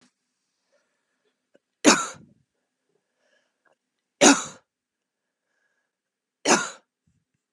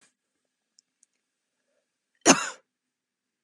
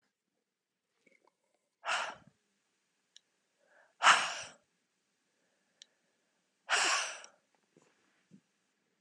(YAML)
three_cough_length: 7.5 s
three_cough_amplitude: 29871
three_cough_signal_mean_std_ratio: 0.2
cough_length: 3.4 s
cough_amplitude: 28077
cough_signal_mean_std_ratio: 0.16
exhalation_length: 9.0 s
exhalation_amplitude: 10426
exhalation_signal_mean_std_ratio: 0.24
survey_phase: beta (2021-08-13 to 2022-03-07)
age: 18-44
gender: Female
wearing_mask: 'No'
symptom_cough_any: true
symptom_runny_or_blocked_nose: true
symptom_shortness_of_breath: true
symptom_sore_throat: true
symptom_headache: true
symptom_loss_of_taste: true
symptom_onset: 4 days
smoker_status: Ex-smoker
respiratory_condition_asthma: false
respiratory_condition_other: false
recruitment_source: Test and Trace
submission_delay: 2 days
covid_test_result: Positive
covid_test_method: RT-qPCR
covid_ct_value: 20.8
covid_ct_gene: ORF1ab gene
covid_ct_mean: 21.2
covid_viral_load: 110000 copies/ml
covid_viral_load_category: Low viral load (10K-1M copies/ml)